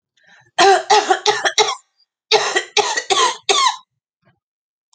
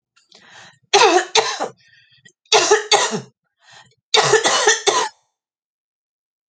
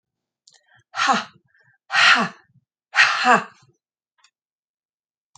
{"cough_length": "4.9 s", "cough_amplitude": 32768, "cough_signal_mean_std_ratio": 0.5, "three_cough_length": "6.5 s", "three_cough_amplitude": 32011, "three_cough_signal_mean_std_ratio": 0.44, "exhalation_length": "5.4 s", "exhalation_amplitude": 28525, "exhalation_signal_mean_std_ratio": 0.34, "survey_phase": "alpha (2021-03-01 to 2021-08-12)", "age": "45-64", "gender": "Female", "wearing_mask": "No", "symptom_change_to_sense_of_smell_or_taste": true, "symptom_onset": "7 days", "smoker_status": "Ex-smoker", "respiratory_condition_asthma": false, "respiratory_condition_other": false, "recruitment_source": "Test and Trace", "submission_delay": "2 days", "covid_test_result": "Positive", "covid_test_method": "RT-qPCR", "covid_ct_value": 20.2, "covid_ct_gene": "ORF1ab gene", "covid_ct_mean": 22.8, "covid_viral_load": "33000 copies/ml", "covid_viral_load_category": "Low viral load (10K-1M copies/ml)"}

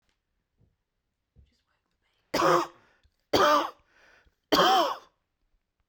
{"three_cough_length": "5.9 s", "three_cough_amplitude": 14816, "three_cough_signal_mean_std_ratio": 0.35, "survey_phase": "beta (2021-08-13 to 2022-03-07)", "age": "18-44", "gender": "Male", "wearing_mask": "No", "symptom_runny_or_blocked_nose": true, "symptom_fatigue": true, "symptom_onset": "13 days", "smoker_status": "Ex-smoker", "respiratory_condition_asthma": false, "respiratory_condition_other": false, "recruitment_source": "REACT", "submission_delay": "1 day", "covid_test_result": "Negative", "covid_test_method": "RT-qPCR", "influenza_a_test_result": "Unknown/Void", "influenza_b_test_result": "Unknown/Void"}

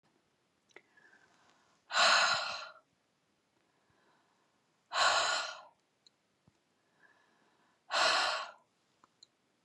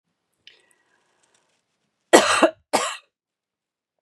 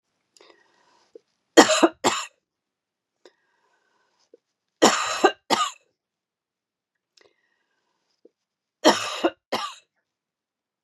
{"exhalation_length": "9.6 s", "exhalation_amplitude": 5905, "exhalation_signal_mean_std_ratio": 0.35, "cough_length": "4.0 s", "cough_amplitude": 32767, "cough_signal_mean_std_ratio": 0.25, "three_cough_length": "10.8 s", "three_cough_amplitude": 32768, "three_cough_signal_mean_std_ratio": 0.25, "survey_phase": "beta (2021-08-13 to 2022-03-07)", "age": "45-64", "gender": "Female", "wearing_mask": "No", "symptom_cough_any": true, "symptom_runny_or_blocked_nose": true, "symptom_sore_throat": true, "symptom_fatigue": true, "symptom_fever_high_temperature": true, "symptom_headache": true, "symptom_onset": "7 days", "smoker_status": "Current smoker (e-cigarettes or vapes only)", "respiratory_condition_asthma": false, "respiratory_condition_other": false, "recruitment_source": "Test and Trace", "submission_delay": "2 days", "covid_test_result": "Positive", "covid_test_method": "RT-qPCR", "covid_ct_value": 15.6, "covid_ct_gene": "ORF1ab gene", "covid_ct_mean": 16.1, "covid_viral_load": "5400000 copies/ml", "covid_viral_load_category": "High viral load (>1M copies/ml)"}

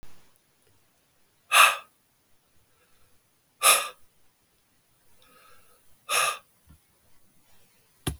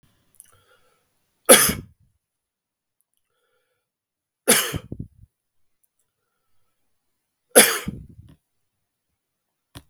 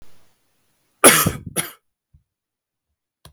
{"exhalation_length": "8.2 s", "exhalation_amplitude": 21775, "exhalation_signal_mean_std_ratio": 0.25, "three_cough_length": "9.9 s", "three_cough_amplitude": 32768, "three_cough_signal_mean_std_ratio": 0.2, "cough_length": "3.3 s", "cough_amplitude": 32768, "cough_signal_mean_std_ratio": 0.25, "survey_phase": "beta (2021-08-13 to 2022-03-07)", "age": "45-64", "gender": "Male", "wearing_mask": "No", "symptom_cough_any": true, "symptom_runny_or_blocked_nose": true, "symptom_shortness_of_breath": true, "symptom_fatigue": true, "symptom_headache": true, "symptom_change_to_sense_of_smell_or_taste": true, "symptom_onset": "4 days", "smoker_status": "Ex-smoker", "respiratory_condition_asthma": false, "respiratory_condition_other": false, "recruitment_source": "Test and Trace", "submission_delay": "2 days", "covid_test_result": "Positive", "covid_test_method": "RT-qPCR", "covid_ct_value": 13.8, "covid_ct_gene": "ORF1ab gene", "covid_ct_mean": 14.1, "covid_viral_load": "25000000 copies/ml", "covid_viral_load_category": "High viral load (>1M copies/ml)"}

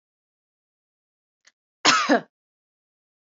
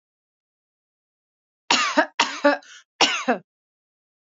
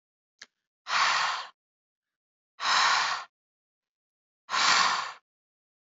{"cough_length": "3.2 s", "cough_amplitude": 25504, "cough_signal_mean_std_ratio": 0.25, "three_cough_length": "4.3 s", "three_cough_amplitude": 30193, "three_cough_signal_mean_std_ratio": 0.34, "exhalation_length": "5.8 s", "exhalation_amplitude": 12017, "exhalation_signal_mean_std_ratio": 0.45, "survey_phase": "beta (2021-08-13 to 2022-03-07)", "age": "18-44", "gender": "Female", "wearing_mask": "No", "symptom_none": true, "smoker_status": "Never smoked", "respiratory_condition_asthma": false, "respiratory_condition_other": false, "recruitment_source": "REACT", "submission_delay": "2 days", "covid_test_result": "Negative", "covid_test_method": "RT-qPCR", "influenza_a_test_result": "Negative", "influenza_b_test_result": "Negative"}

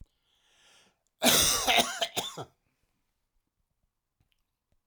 {"cough_length": "4.9 s", "cough_amplitude": 12551, "cough_signal_mean_std_ratio": 0.33, "survey_phase": "alpha (2021-03-01 to 2021-08-12)", "age": "65+", "gender": "Male", "wearing_mask": "No", "symptom_none": true, "smoker_status": "Ex-smoker", "respiratory_condition_asthma": false, "respiratory_condition_other": true, "recruitment_source": "REACT", "submission_delay": "4 days", "covid_test_result": "Negative", "covid_test_method": "RT-qPCR"}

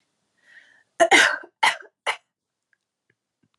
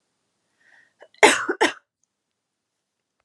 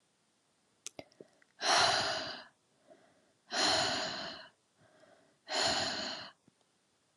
{"three_cough_length": "3.6 s", "three_cough_amplitude": 24580, "three_cough_signal_mean_std_ratio": 0.29, "cough_length": "3.2 s", "cough_amplitude": 32558, "cough_signal_mean_std_ratio": 0.23, "exhalation_length": "7.2 s", "exhalation_amplitude": 6067, "exhalation_signal_mean_std_ratio": 0.46, "survey_phase": "alpha (2021-03-01 to 2021-08-12)", "age": "18-44", "gender": "Female", "wearing_mask": "No", "symptom_cough_any": true, "symptom_abdominal_pain": true, "symptom_diarrhoea": true, "symptom_fatigue": true, "symptom_fever_high_temperature": true, "symptom_headache": true, "symptom_change_to_sense_of_smell_or_taste": true, "symptom_loss_of_taste": true, "symptom_onset": "3 days", "smoker_status": "Never smoked", "respiratory_condition_asthma": false, "respiratory_condition_other": false, "recruitment_source": "Test and Trace", "submission_delay": "2 days", "covid_test_result": "Positive", "covid_test_method": "RT-qPCR", "covid_ct_value": 17.7, "covid_ct_gene": "ORF1ab gene", "covid_ct_mean": 18.4, "covid_viral_load": "930000 copies/ml", "covid_viral_load_category": "Low viral load (10K-1M copies/ml)"}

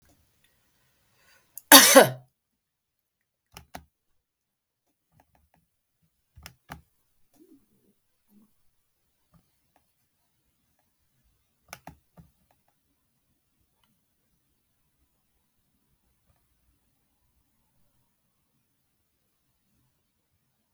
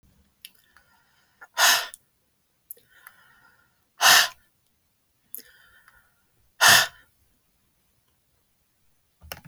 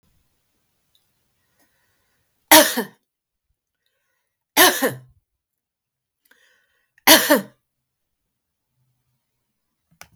{"cough_length": "20.7 s", "cough_amplitude": 32768, "cough_signal_mean_std_ratio": 0.11, "exhalation_length": "9.5 s", "exhalation_amplitude": 27338, "exhalation_signal_mean_std_ratio": 0.23, "three_cough_length": "10.2 s", "three_cough_amplitude": 32768, "three_cough_signal_mean_std_ratio": 0.21, "survey_phase": "beta (2021-08-13 to 2022-03-07)", "age": "65+", "gender": "Female", "wearing_mask": "No", "symptom_none": true, "smoker_status": "Never smoked", "respiratory_condition_asthma": false, "respiratory_condition_other": false, "recruitment_source": "REACT", "submission_delay": "1 day", "covid_test_result": "Negative", "covid_test_method": "RT-qPCR", "influenza_a_test_result": "Negative", "influenza_b_test_result": "Negative"}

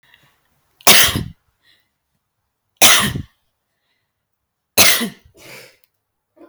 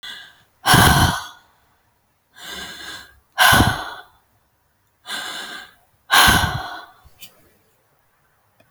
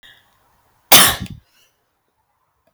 {"three_cough_length": "6.5 s", "three_cough_amplitude": 32768, "three_cough_signal_mean_std_ratio": 0.3, "exhalation_length": "8.7 s", "exhalation_amplitude": 32768, "exhalation_signal_mean_std_ratio": 0.37, "cough_length": "2.7 s", "cough_amplitude": 32768, "cough_signal_mean_std_ratio": 0.24, "survey_phase": "beta (2021-08-13 to 2022-03-07)", "age": "18-44", "gender": "Female", "wearing_mask": "No", "symptom_none": true, "smoker_status": "Never smoked", "respiratory_condition_asthma": false, "respiratory_condition_other": false, "recruitment_source": "Test and Trace", "submission_delay": "-1 day", "covid_test_result": "Negative", "covid_test_method": "LFT"}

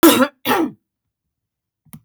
{"cough_length": "2.0 s", "cough_amplitude": 30794, "cough_signal_mean_std_ratio": 0.37, "survey_phase": "beta (2021-08-13 to 2022-03-07)", "age": "45-64", "gender": "Female", "wearing_mask": "No", "symptom_cough_any": true, "symptom_onset": "12 days", "smoker_status": "Never smoked", "respiratory_condition_asthma": false, "respiratory_condition_other": false, "recruitment_source": "REACT", "submission_delay": "3 days", "covid_test_result": "Negative", "covid_test_method": "RT-qPCR", "influenza_a_test_result": "Negative", "influenza_b_test_result": "Negative"}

